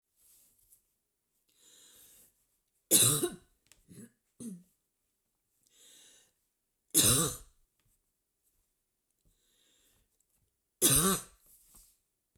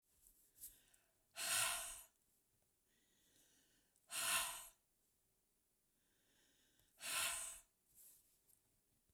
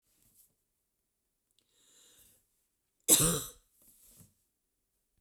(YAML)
three_cough_length: 12.4 s
three_cough_amplitude: 10547
three_cough_signal_mean_std_ratio: 0.25
exhalation_length: 9.1 s
exhalation_amplitude: 1556
exhalation_signal_mean_std_ratio: 0.36
cough_length: 5.2 s
cough_amplitude: 14453
cough_signal_mean_std_ratio: 0.2
survey_phase: beta (2021-08-13 to 2022-03-07)
age: 45-64
gender: Female
wearing_mask: 'No'
symptom_none: true
smoker_status: Ex-smoker
respiratory_condition_asthma: false
respiratory_condition_other: false
recruitment_source: REACT
submission_delay: 0 days
covid_test_result: Negative
covid_test_method: RT-qPCR
influenza_a_test_result: Unknown/Void
influenza_b_test_result: Unknown/Void